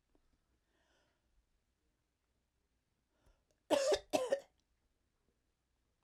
{"cough_length": "6.0 s", "cough_amplitude": 4510, "cough_signal_mean_std_ratio": 0.23, "survey_phase": "alpha (2021-03-01 to 2021-08-12)", "age": "65+", "gender": "Female", "wearing_mask": "No", "symptom_none": true, "smoker_status": "Ex-smoker", "respiratory_condition_asthma": false, "respiratory_condition_other": false, "recruitment_source": "REACT", "submission_delay": "2 days", "covid_test_result": "Negative", "covid_test_method": "RT-qPCR"}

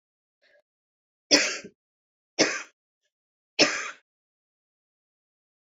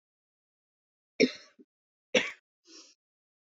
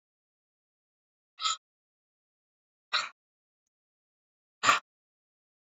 {"three_cough_length": "5.7 s", "three_cough_amplitude": 22308, "three_cough_signal_mean_std_ratio": 0.24, "cough_length": "3.6 s", "cough_amplitude": 12262, "cough_signal_mean_std_ratio": 0.19, "exhalation_length": "5.7 s", "exhalation_amplitude": 12880, "exhalation_signal_mean_std_ratio": 0.19, "survey_phase": "beta (2021-08-13 to 2022-03-07)", "age": "45-64", "gender": "Female", "wearing_mask": "No", "symptom_cough_any": true, "symptom_runny_or_blocked_nose": true, "symptom_fatigue": true, "symptom_fever_high_temperature": true, "symptom_headache": true, "symptom_onset": "3 days", "smoker_status": "Never smoked", "respiratory_condition_asthma": false, "respiratory_condition_other": false, "recruitment_source": "Test and Trace", "submission_delay": "1 day", "covid_test_result": "Positive", "covid_test_method": "RT-qPCR", "covid_ct_value": 21.3, "covid_ct_gene": "ORF1ab gene", "covid_ct_mean": 22.3, "covid_viral_load": "47000 copies/ml", "covid_viral_load_category": "Low viral load (10K-1M copies/ml)"}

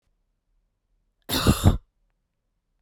{"cough_length": "2.8 s", "cough_amplitude": 21817, "cough_signal_mean_std_ratio": 0.28, "survey_phase": "beta (2021-08-13 to 2022-03-07)", "age": "18-44", "gender": "Female", "wearing_mask": "No", "symptom_cough_any": true, "symptom_sore_throat": true, "symptom_diarrhoea": true, "symptom_fatigue": true, "smoker_status": "Never smoked", "respiratory_condition_asthma": false, "respiratory_condition_other": false, "recruitment_source": "Test and Trace", "submission_delay": "1 day", "covid_test_result": "Positive", "covid_test_method": "RT-qPCR", "covid_ct_value": 22.5, "covid_ct_gene": "ORF1ab gene", "covid_ct_mean": 23.4, "covid_viral_load": "22000 copies/ml", "covid_viral_load_category": "Low viral load (10K-1M copies/ml)"}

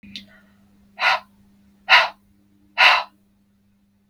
{"exhalation_length": "4.1 s", "exhalation_amplitude": 32766, "exhalation_signal_mean_std_ratio": 0.31, "survey_phase": "beta (2021-08-13 to 2022-03-07)", "age": "18-44", "gender": "Female", "wearing_mask": "No", "symptom_none": true, "smoker_status": "Never smoked", "respiratory_condition_asthma": false, "respiratory_condition_other": false, "recruitment_source": "REACT", "submission_delay": "3 days", "covid_test_result": "Negative", "covid_test_method": "RT-qPCR"}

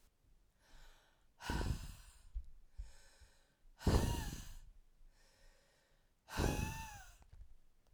{"exhalation_length": "7.9 s", "exhalation_amplitude": 3316, "exhalation_signal_mean_std_ratio": 0.42, "survey_phase": "beta (2021-08-13 to 2022-03-07)", "age": "18-44", "gender": "Female", "wearing_mask": "No", "symptom_cough_any": true, "symptom_runny_or_blocked_nose": true, "symptom_shortness_of_breath": true, "symptom_fatigue": true, "symptom_headache": true, "symptom_onset": "4 days", "smoker_status": "Never smoked", "respiratory_condition_asthma": false, "respiratory_condition_other": false, "recruitment_source": "Test and Trace", "submission_delay": "2 days", "covid_test_result": "Positive", "covid_test_method": "RT-qPCR", "covid_ct_value": 19.6, "covid_ct_gene": "N gene", "covid_ct_mean": 20.2, "covid_viral_load": "240000 copies/ml", "covid_viral_load_category": "Low viral load (10K-1M copies/ml)"}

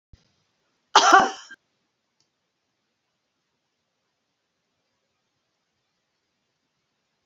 {"cough_length": "7.3 s", "cough_amplitude": 27892, "cough_signal_mean_std_ratio": 0.16, "survey_phase": "alpha (2021-03-01 to 2021-08-12)", "age": "65+", "gender": "Female", "wearing_mask": "No", "symptom_none": true, "smoker_status": "Never smoked", "respiratory_condition_asthma": false, "respiratory_condition_other": false, "recruitment_source": "REACT", "submission_delay": "4 days", "covid_test_result": "Negative", "covid_test_method": "RT-qPCR"}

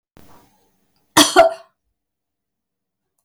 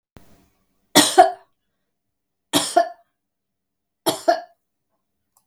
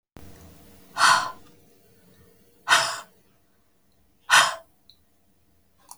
{"cough_length": "3.2 s", "cough_amplitude": 32768, "cough_signal_mean_std_ratio": 0.24, "three_cough_length": "5.5 s", "three_cough_amplitude": 32768, "three_cough_signal_mean_std_ratio": 0.27, "exhalation_length": "6.0 s", "exhalation_amplitude": 22308, "exhalation_signal_mean_std_ratio": 0.3, "survey_phase": "beta (2021-08-13 to 2022-03-07)", "age": "45-64", "gender": "Female", "wearing_mask": "No", "symptom_cough_any": true, "symptom_onset": "4 days", "smoker_status": "Never smoked", "respiratory_condition_asthma": false, "respiratory_condition_other": false, "recruitment_source": "REACT", "submission_delay": "1 day", "covid_test_result": "Negative", "covid_test_method": "RT-qPCR", "influenza_a_test_result": "Unknown/Void", "influenza_b_test_result": "Unknown/Void"}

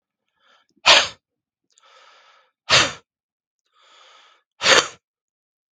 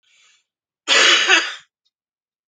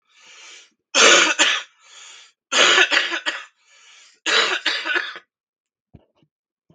{"exhalation_length": "5.7 s", "exhalation_amplitude": 32768, "exhalation_signal_mean_std_ratio": 0.26, "cough_length": "2.5 s", "cough_amplitude": 32768, "cough_signal_mean_std_ratio": 0.4, "three_cough_length": "6.7 s", "three_cough_amplitude": 32767, "three_cough_signal_mean_std_ratio": 0.43, "survey_phase": "beta (2021-08-13 to 2022-03-07)", "age": "18-44", "gender": "Male", "wearing_mask": "No", "symptom_cough_any": true, "symptom_runny_or_blocked_nose": true, "symptom_diarrhoea": true, "symptom_fatigue": true, "symptom_fever_high_temperature": true, "symptom_onset": "3 days", "smoker_status": "Ex-smoker", "respiratory_condition_asthma": false, "respiratory_condition_other": false, "recruitment_source": "Test and Trace", "submission_delay": "2 days", "covid_test_result": "Positive", "covid_test_method": "RT-qPCR", "covid_ct_value": 25.9, "covid_ct_gene": "N gene", "covid_ct_mean": 26.6, "covid_viral_load": "2000 copies/ml", "covid_viral_load_category": "Minimal viral load (< 10K copies/ml)"}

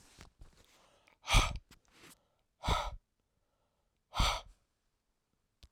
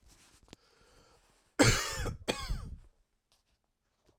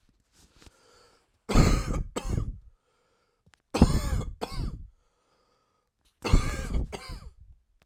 {"exhalation_length": "5.7 s", "exhalation_amplitude": 6600, "exhalation_signal_mean_std_ratio": 0.29, "cough_length": "4.2 s", "cough_amplitude": 12147, "cough_signal_mean_std_ratio": 0.32, "three_cough_length": "7.9 s", "three_cough_amplitude": 19845, "three_cough_signal_mean_std_ratio": 0.39, "survey_phase": "beta (2021-08-13 to 2022-03-07)", "age": "18-44", "gender": "Male", "wearing_mask": "No", "symptom_cough_any": true, "symptom_new_continuous_cough": true, "symptom_sore_throat": true, "symptom_fatigue": true, "symptom_fever_high_temperature": true, "symptom_onset": "3 days", "smoker_status": "Never smoked", "respiratory_condition_asthma": false, "respiratory_condition_other": false, "recruitment_source": "Test and Trace", "submission_delay": "2 days", "covid_test_result": "Positive", "covid_test_method": "RT-qPCR", "covid_ct_value": 22.3, "covid_ct_gene": "ORF1ab gene"}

